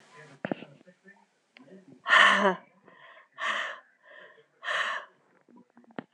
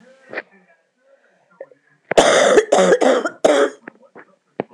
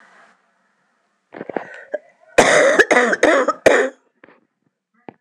exhalation_length: 6.1 s
exhalation_amplitude: 15100
exhalation_signal_mean_std_ratio: 0.33
cough_length: 4.7 s
cough_amplitude: 26028
cough_signal_mean_std_ratio: 0.44
three_cough_length: 5.2 s
three_cough_amplitude: 26028
three_cough_signal_mean_std_ratio: 0.41
survey_phase: alpha (2021-03-01 to 2021-08-12)
age: 45-64
gender: Female
wearing_mask: 'No'
symptom_cough_any: true
symptom_new_continuous_cough: true
symptom_shortness_of_breath: true
symptom_diarrhoea: true
symptom_fatigue: true
symptom_fever_high_temperature: true
symptom_headache: true
symptom_change_to_sense_of_smell_or_taste: true
symptom_loss_of_taste: true
symptom_onset: 4 days
smoker_status: Never smoked
respiratory_condition_asthma: false
respiratory_condition_other: false
recruitment_source: Test and Trace
submission_delay: 2 days
covid_test_result: Positive
covid_test_method: RT-qPCR
covid_ct_value: 16.8
covid_ct_gene: ORF1ab gene
covid_ct_mean: 17.1
covid_viral_load: 2500000 copies/ml
covid_viral_load_category: High viral load (>1M copies/ml)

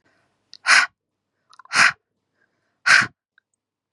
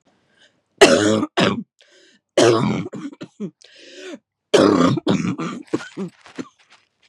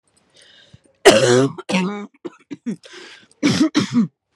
exhalation_length: 3.9 s
exhalation_amplitude: 28280
exhalation_signal_mean_std_ratio: 0.3
three_cough_length: 7.1 s
three_cough_amplitude: 32768
three_cough_signal_mean_std_ratio: 0.45
cough_length: 4.4 s
cough_amplitude: 32768
cough_signal_mean_std_ratio: 0.46
survey_phase: beta (2021-08-13 to 2022-03-07)
age: 18-44
gender: Female
wearing_mask: 'No'
symptom_runny_or_blocked_nose: true
symptom_abdominal_pain: true
symptom_fatigue: true
symptom_headache: true
smoker_status: Current smoker (e-cigarettes or vapes only)
respiratory_condition_asthma: true
respiratory_condition_other: false
recruitment_source: Test and Trace
submission_delay: 2 days
covid_test_result: Positive
covid_test_method: ePCR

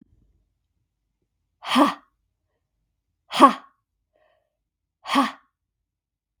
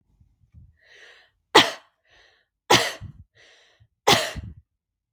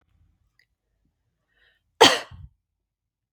exhalation_length: 6.4 s
exhalation_amplitude: 32766
exhalation_signal_mean_std_ratio: 0.22
three_cough_length: 5.1 s
three_cough_amplitude: 32768
three_cough_signal_mean_std_ratio: 0.25
cough_length: 3.3 s
cough_amplitude: 32766
cough_signal_mean_std_ratio: 0.17
survey_phase: beta (2021-08-13 to 2022-03-07)
age: 18-44
gender: Female
wearing_mask: 'No'
symptom_fatigue: true
symptom_onset: 12 days
smoker_status: Ex-smoker
respiratory_condition_asthma: false
respiratory_condition_other: false
recruitment_source: REACT
submission_delay: 1 day
covid_test_result: Negative
covid_test_method: RT-qPCR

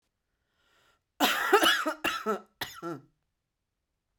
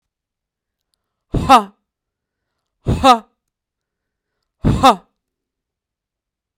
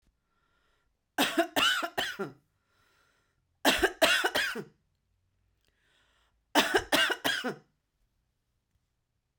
cough_length: 4.2 s
cough_amplitude: 13278
cough_signal_mean_std_ratio: 0.39
exhalation_length: 6.6 s
exhalation_amplitude: 32768
exhalation_signal_mean_std_ratio: 0.26
three_cough_length: 9.4 s
three_cough_amplitude: 13449
three_cough_signal_mean_std_ratio: 0.38
survey_phase: beta (2021-08-13 to 2022-03-07)
age: 18-44
gender: Female
wearing_mask: 'No'
symptom_none: true
smoker_status: Never smoked
respiratory_condition_asthma: false
respiratory_condition_other: false
recruitment_source: REACT
submission_delay: 1 day
covid_test_result: Negative
covid_test_method: RT-qPCR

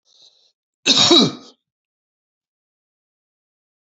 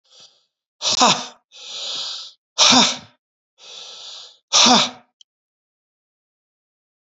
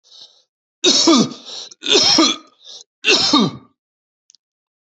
cough_length: 3.8 s
cough_amplitude: 30839
cough_signal_mean_std_ratio: 0.27
exhalation_length: 7.1 s
exhalation_amplitude: 32543
exhalation_signal_mean_std_ratio: 0.35
three_cough_length: 4.9 s
three_cough_amplitude: 30374
three_cough_signal_mean_std_ratio: 0.47
survey_phase: beta (2021-08-13 to 2022-03-07)
age: 45-64
gender: Male
wearing_mask: 'No'
symptom_cough_any: true
symptom_new_continuous_cough: true
symptom_runny_or_blocked_nose: true
symptom_shortness_of_breath: true
symptom_sore_throat: true
symptom_fatigue: true
symptom_headache: true
smoker_status: Never smoked
respiratory_condition_asthma: false
respiratory_condition_other: false
recruitment_source: Test and Trace
submission_delay: 2 days
covid_test_result: Positive
covid_test_method: LFT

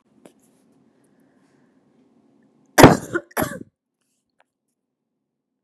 cough_length: 5.6 s
cough_amplitude: 32768
cough_signal_mean_std_ratio: 0.17
survey_phase: beta (2021-08-13 to 2022-03-07)
age: 18-44
gender: Female
wearing_mask: 'No'
symptom_cough_any: true
symptom_runny_or_blocked_nose: true
symptom_sore_throat: true
symptom_change_to_sense_of_smell_or_taste: true
symptom_other: true
symptom_onset: 3 days
smoker_status: Never smoked
respiratory_condition_asthma: false
respiratory_condition_other: false
recruitment_source: Test and Trace
submission_delay: 1 day
covid_test_result: Positive
covid_test_method: ePCR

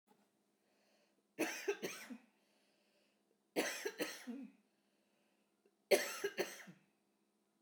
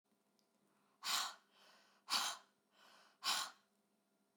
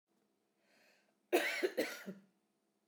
three_cough_length: 7.6 s
three_cough_amplitude: 4335
three_cough_signal_mean_std_ratio: 0.33
exhalation_length: 4.4 s
exhalation_amplitude: 2519
exhalation_signal_mean_std_ratio: 0.36
cough_length: 2.9 s
cough_amplitude: 3827
cough_signal_mean_std_ratio: 0.35
survey_phase: beta (2021-08-13 to 2022-03-07)
age: 45-64
gender: Female
wearing_mask: 'No'
symptom_none: true
smoker_status: Current smoker (e-cigarettes or vapes only)
respiratory_condition_asthma: false
respiratory_condition_other: false
recruitment_source: REACT
submission_delay: 1 day
covid_test_result: Negative
covid_test_method: RT-qPCR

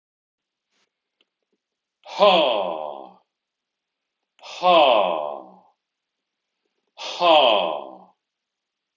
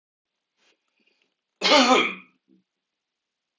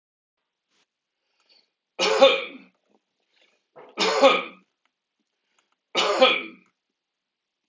exhalation_length: 9.0 s
exhalation_amplitude: 25250
exhalation_signal_mean_std_ratio: 0.37
cough_length: 3.6 s
cough_amplitude: 22729
cough_signal_mean_std_ratio: 0.29
three_cough_length: 7.7 s
three_cough_amplitude: 23719
three_cough_signal_mean_std_ratio: 0.31
survey_phase: beta (2021-08-13 to 2022-03-07)
age: 65+
gender: Male
wearing_mask: 'No'
symptom_none: true
smoker_status: Ex-smoker
respiratory_condition_asthma: false
respiratory_condition_other: false
recruitment_source: REACT
submission_delay: 5 days
covid_test_result: Negative
covid_test_method: RT-qPCR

